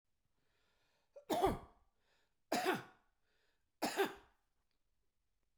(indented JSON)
{
  "three_cough_length": "5.6 s",
  "three_cough_amplitude": 2769,
  "three_cough_signal_mean_std_ratio": 0.32,
  "survey_phase": "beta (2021-08-13 to 2022-03-07)",
  "age": "65+",
  "gender": "Male",
  "wearing_mask": "No",
  "symptom_none": true,
  "smoker_status": "Never smoked",
  "respiratory_condition_asthma": false,
  "respiratory_condition_other": false,
  "recruitment_source": "REACT",
  "submission_delay": "1 day",
  "covid_test_result": "Negative",
  "covid_test_method": "RT-qPCR"
}